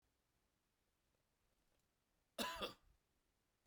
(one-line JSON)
{"cough_length": "3.7 s", "cough_amplitude": 1112, "cough_signal_mean_std_ratio": 0.26, "survey_phase": "beta (2021-08-13 to 2022-03-07)", "age": "45-64", "gender": "Male", "wearing_mask": "No", "symptom_none": true, "symptom_onset": "4 days", "smoker_status": "Never smoked", "respiratory_condition_asthma": false, "respiratory_condition_other": false, "recruitment_source": "Test and Trace", "submission_delay": "1 day", "covid_test_result": "Positive", "covid_test_method": "RT-qPCR", "covid_ct_value": 18.0, "covid_ct_gene": "N gene"}